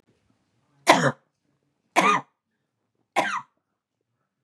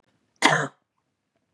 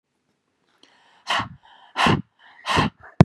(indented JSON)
{
  "three_cough_length": "4.4 s",
  "three_cough_amplitude": 32260,
  "three_cough_signal_mean_std_ratio": 0.29,
  "cough_length": "1.5 s",
  "cough_amplitude": 29285,
  "cough_signal_mean_std_ratio": 0.29,
  "exhalation_length": "3.2 s",
  "exhalation_amplitude": 32768,
  "exhalation_signal_mean_std_ratio": 0.3,
  "survey_phase": "beta (2021-08-13 to 2022-03-07)",
  "age": "45-64",
  "gender": "Female",
  "wearing_mask": "No",
  "symptom_cough_any": true,
  "symptom_runny_or_blocked_nose": true,
  "symptom_onset": "9 days",
  "smoker_status": "Never smoked",
  "respiratory_condition_asthma": false,
  "respiratory_condition_other": false,
  "recruitment_source": "REACT",
  "submission_delay": "1 day",
  "covid_test_result": "Negative",
  "covid_test_method": "RT-qPCR",
  "influenza_a_test_result": "Negative",
  "influenza_b_test_result": "Negative"
}